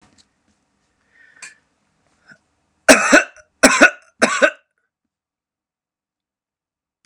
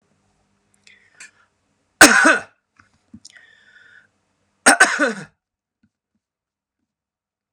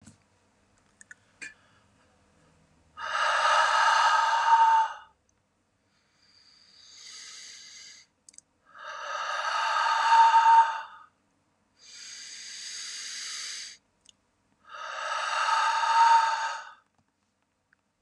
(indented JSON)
{
  "three_cough_length": "7.1 s",
  "three_cough_amplitude": 32768,
  "three_cough_signal_mean_std_ratio": 0.25,
  "cough_length": "7.5 s",
  "cough_amplitude": 32768,
  "cough_signal_mean_std_ratio": 0.24,
  "exhalation_length": "18.0 s",
  "exhalation_amplitude": 11633,
  "exhalation_signal_mean_std_ratio": 0.48,
  "survey_phase": "beta (2021-08-13 to 2022-03-07)",
  "age": "45-64",
  "gender": "Male",
  "wearing_mask": "No",
  "symptom_none": true,
  "smoker_status": "Never smoked",
  "respiratory_condition_asthma": false,
  "respiratory_condition_other": false,
  "recruitment_source": "REACT",
  "submission_delay": "1 day",
  "covid_test_result": "Negative",
  "covid_test_method": "RT-qPCR",
  "influenza_a_test_result": "Negative",
  "influenza_b_test_result": "Negative"
}